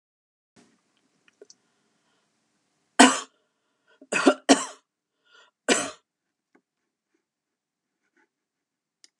{"three_cough_length": "9.2 s", "three_cough_amplitude": 32767, "three_cough_signal_mean_std_ratio": 0.19, "survey_phase": "alpha (2021-03-01 to 2021-08-12)", "age": "65+", "gender": "Female", "wearing_mask": "No", "symptom_fatigue": true, "smoker_status": "Never smoked", "respiratory_condition_asthma": false, "respiratory_condition_other": false, "recruitment_source": "REACT", "submission_delay": "2 days", "covid_test_result": "Negative", "covid_test_method": "RT-qPCR"}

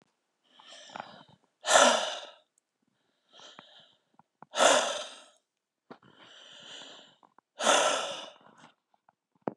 {"exhalation_length": "9.6 s", "exhalation_amplitude": 15317, "exhalation_signal_mean_std_ratio": 0.32, "survey_phase": "beta (2021-08-13 to 2022-03-07)", "age": "18-44", "gender": "Female", "wearing_mask": "No", "symptom_shortness_of_breath": true, "symptom_fatigue": true, "symptom_headache": true, "symptom_onset": "7 days", "smoker_status": "Current smoker (1 to 10 cigarettes per day)", "respiratory_condition_asthma": true, "respiratory_condition_other": false, "recruitment_source": "REACT", "submission_delay": "1 day", "covid_test_result": "Negative", "covid_test_method": "RT-qPCR", "influenza_a_test_result": "Negative", "influenza_b_test_result": "Negative"}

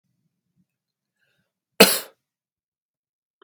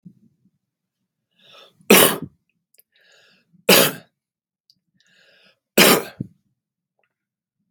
{"cough_length": "3.4 s", "cough_amplitude": 32767, "cough_signal_mean_std_ratio": 0.15, "three_cough_length": "7.7 s", "three_cough_amplitude": 32768, "three_cough_signal_mean_std_ratio": 0.24, "survey_phase": "beta (2021-08-13 to 2022-03-07)", "age": "45-64", "gender": "Male", "wearing_mask": "No", "symptom_cough_any": true, "symptom_fatigue": true, "symptom_headache": true, "symptom_onset": "2 days", "smoker_status": "Never smoked", "respiratory_condition_asthma": false, "respiratory_condition_other": false, "recruitment_source": "Test and Trace", "submission_delay": "1 day", "covid_test_result": "Positive", "covid_test_method": "RT-qPCR"}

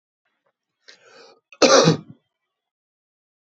{"cough_length": "3.5 s", "cough_amplitude": 29100, "cough_signal_mean_std_ratio": 0.26, "survey_phase": "beta (2021-08-13 to 2022-03-07)", "age": "45-64", "gender": "Male", "wearing_mask": "No", "symptom_none": true, "smoker_status": "Current smoker (11 or more cigarettes per day)", "respiratory_condition_asthma": false, "respiratory_condition_other": false, "recruitment_source": "REACT", "submission_delay": "4 days", "covid_test_result": "Negative", "covid_test_method": "RT-qPCR"}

